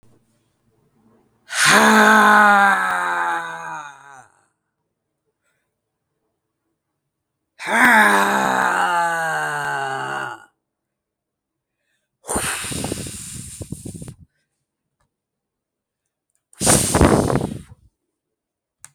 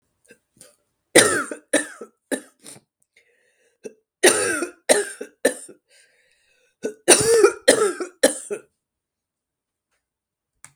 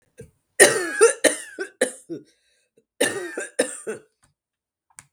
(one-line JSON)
{"exhalation_length": "18.9 s", "exhalation_amplitude": 32766, "exhalation_signal_mean_std_ratio": 0.43, "three_cough_length": "10.8 s", "three_cough_amplitude": 32768, "three_cough_signal_mean_std_ratio": 0.33, "cough_length": "5.1 s", "cough_amplitude": 32768, "cough_signal_mean_std_ratio": 0.34, "survey_phase": "beta (2021-08-13 to 2022-03-07)", "age": "45-64", "gender": "Female", "wearing_mask": "No", "symptom_cough_any": true, "symptom_runny_or_blocked_nose": true, "symptom_sore_throat": true, "symptom_onset": "3 days", "smoker_status": "Current smoker (1 to 10 cigarettes per day)", "respiratory_condition_asthma": false, "respiratory_condition_other": false, "recruitment_source": "Test and Trace", "submission_delay": "1 day", "covid_test_result": "Positive", "covid_test_method": "RT-qPCR"}